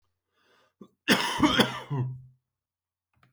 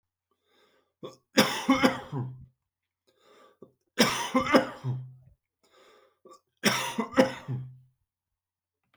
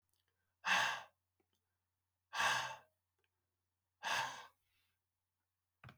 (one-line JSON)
{"cough_length": "3.3 s", "cough_amplitude": 17012, "cough_signal_mean_std_ratio": 0.39, "three_cough_length": "9.0 s", "three_cough_amplitude": 19106, "three_cough_signal_mean_std_ratio": 0.36, "exhalation_length": "6.0 s", "exhalation_amplitude": 2727, "exhalation_signal_mean_std_ratio": 0.34, "survey_phase": "beta (2021-08-13 to 2022-03-07)", "age": "45-64", "gender": "Male", "wearing_mask": "No", "symptom_cough_any": true, "symptom_onset": "8 days", "smoker_status": "Never smoked", "respiratory_condition_asthma": false, "respiratory_condition_other": false, "recruitment_source": "Test and Trace", "submission_delay": "4 days", "covid_test_result": "Negative", "covid_test_method": "RT-qPCR"}